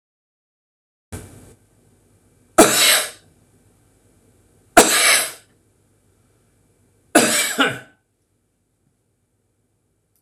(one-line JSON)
{"three_cough_length": "10.2 s", "three_cough_amplitude": 26028, "three_cough_signal_mean_std_ratio": 0.3, "survey_phase": "beta (2021-08-13 to 2022-03-07)", "age": "65+", "gender": "Male", "wearing_mask": "No", "symptom_none": true, "smoker_status": "Ex-smoker", "respiratory_condition_asthma": false, "respiratory_condition_other": false, "recruitment_source": "REACT", "submission_delay": "3 days", "covid_test_result": "Negative", "covid_test_method": "RT-qPCR"}